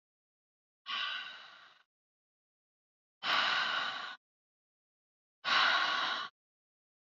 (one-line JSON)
{"exhalation_length": "7.2 s", "exhalation_amplitude": 5746, "exhalation_signal_mean_std_ratio": 0.43, "survey_phase": "alpha (2021-03-01 to 2021-08-12)", "age": "18-44", "gender": "Female", "wearing_mask": "No", "symptom_none": true, "smoker_status": "Never smoked", "respiratory_condition_asthma": true, "respiratory_condition_other": false, "recruitment_source": "REACT", "submission_delay": "1 day", "covid_test_result": "Negative", "covid_test_method": "RT-qPCR"}